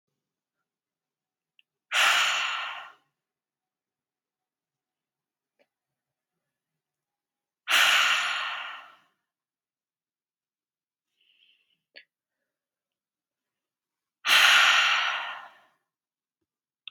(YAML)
exhalation_length: 16.9 s
exhalation_amplitude: 18310
exhalation_signal_mean_std_ratio: 0.31
survey_phase: beta (2021-08-13 to 2022-03-07)
age: 18-44
gender: Female
wearing_mask: 'Yes'
symptom_cough_any: true
symptom_runny_or_blocked_nose: true
symptom_headache: true
smoker_status: Never smoked
respiratory_condition_asthma: false
respiratory_condition_other: false
recruitment_source: Test and Trace
submission_delay: 1 day
covid_test_result: Positive
covid_test_method: ePCR